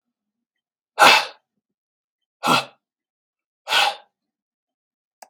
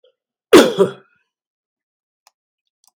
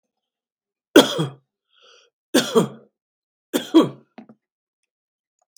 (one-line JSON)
{"exhalation_length": "5.3 s", "exhalation_amplitude": 32767, "exhalation_signal_mean_std_ratio": 0.26, "cough_length": "3.0 s", "cough_amplitude": 32768, "cough_signal_mean_std_ratio": 0.24, "three_cough_length": "5.6 s", "three_cough_amplitude": 32767, "three_cough_signal_mean_std_ratio": 0.26, "survey_phase": "beta (2021-08-13 to 2022-03-07)", "age": "65+", "gender": "Male", "wearing_mask": "No", "symptom_none": true, "smoker_status": "Never smoked", "respiratory_condition_asthma": false, "respiratory_condition_other": false, "recruitment_source": "REACT", "submission_delay": "1 day", "covid_test_result": "Negative", "covid_test_method": "RT-qPCR", "influenza_a_test_result": "Negative", "influenza_b_test_result": "Negative"}